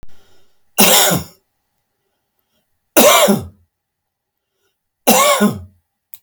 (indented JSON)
{
  "three_cough_length": "6.2 s",
  "three_cough_amplitude": 32768,
  "three_cough_signal_mean_std_ratio": 0.4,
  "survey_phase": "beta (2021-08-13 to 2022-03-07)",
  "age": "65+",
  "gender": "Male",
  "wearing_mask": "No",
  "symptom_runny_or_blocked_nose": true,
  "smoker_status": "Ex-smoker",
  "respiratory_condition_asthma": false,
  "respiratory_condition_other": false,
  "recruitment_source": "REACT",
  "submission_delay": "1 day",
  "covid_test_result": "Negative",
  "covid_test_method": "RT-qPCR"
}